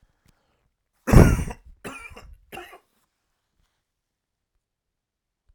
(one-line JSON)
{"three_cough_length": "5.5 s", "three_cough_amplitude": 32768, "three_cough_signal_mean_std_ratio": 0.2, "survey_phase": "alpha (2021-03-01 to 2021-08-12)", "age": "45-64", "gender": "Male", "wearing_mask": "No", "symptom_none": true, "smoker_status": "Ex-smoker", "respiratory_condition_asthma": false, "respiratory_condition_other": false, "recruitment_source": "REACT", "submission_delay": "1 day", "covid_test_result": "Negative", "covid_test_method": "RT-qPCR"}